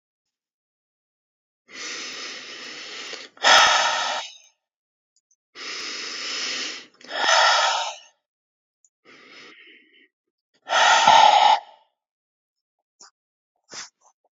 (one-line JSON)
{"exhalation_length": "14.3 s", "exhalation_amplitude": 27692, "exhalation_signal_mean_std_ratio": 0.38, "survey_phase": "beta (2021-08-13 to 2022-03-07)", "age": "45-64", "gender": "Male", "wearing_mask": "No", "symptom_cough_any": true, "symptom_headache": true, "smoker_status": "Ex-smoker", "respiratory_condition_asthma": false, "respiratory_condition_other": false, "recruitment_source": "Test and Trace", "submission_delay": "2 days", "covid_test_result": "Positive", "covid_test_method": "RT-qPCR"}